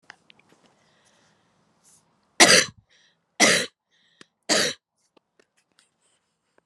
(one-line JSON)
{"three_cough_length": "6.7 s", "three_cough_amplitude": 31789, "three_cough_signal_mean_std_ratio": 0.24, "survey_phase": "beta (2021-08-13 to 2022-03-07)", "age": "45-64", "gender": "Female", "wearing_mask": "No", "symptom_cough_any": true, "symptom_runny_or_blocked_nose": true, "symptom_abdominal_pain": true, "symptom_fatigue": true, "symptom_headache": true, "symptom_change_to_sense_of_smell_or_taste": true, "symptom_loss_of_taste": true, "symptom_onset": "5 days", "smoker_status": "Never smoked", "respiratory_condition_asthma": false, "respiratory_condition_other": false, "recruitment_source": "Test and Trace", "submission_delay": "3 days", "covid_test_result": "Positive", "covid_test_method": "RT-qPCR", "covid_ct_value": 16.6, "covid_ct_gene": "ORF1ab gene", "covid_ct_mean": 17.1, "covid_viral_load": "2400000 copies/ml", "covid_viral_load_category": "High viral load (>1M copies/ml)"}